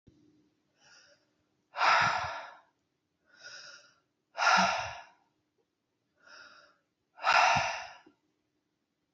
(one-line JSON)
{"exhalation_length": "9.1 s", "exhalation_amplitude": 10086, "exhalation_signal_mean_std_ratio": 0.35, "survey_phase": "beta (2021-08-13 to 2022-03-07)", "age": "45-64", "gender": "Female", "wearing_mask": "No", "symptom_none": true, "smoker_status": "Never smoked", "respiratory_condition_asthma": false, "respiratory_condition_other": false, "recruitment_source": "REACT", "submission_delay": "31 days", "covid_test_result": "Negative", "covid_test_method": "RT-qPCR", "influenza_a_test_result": "Unknown/Void", "influenza_b_test_result": "Unknown/Void"}